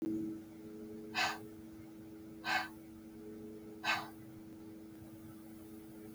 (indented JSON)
{
  "exhalation_length": "6.1 s",
  "exhalation_amplitude": 2592,
  "exhalation_signal_mean_std_ratio": 0.7,
  "survey_phase": "beta (2021-08-13 to 2022-03-07)",
  "age": "45-64",
  "gender": "Female",
  "wearing_mask": "No",
  "symptom_cough_any": true,
  "symptom_runny_or_blocked_nose": true,
  "symptom_headache": true,
  "symptom_change_to_sense_of_smell_or_taste": true,
  "symptom_other": true,
  "symptom_onset": "7 days",
  "smoker_status": "Never smoked",
  "respiratory_condition_asthma": false,
  "respiratory_condition_other": false,
  "recruitment_source": "Test and Trace",
  "submission_delay": "1 day",
  "covid_test_result": "Positive",
  "covid_test_method": "RT-qPCR",
  "covid_ct_value": 15.4,
  "covid_ct_gene": "ORF1ab gene",
  "covid_ct_mean": 16.9,
  "covid_viral_load": "2800000 copies/ml",
  "covid_viral_load_category": "High viral load (>1M copies/ml)"
}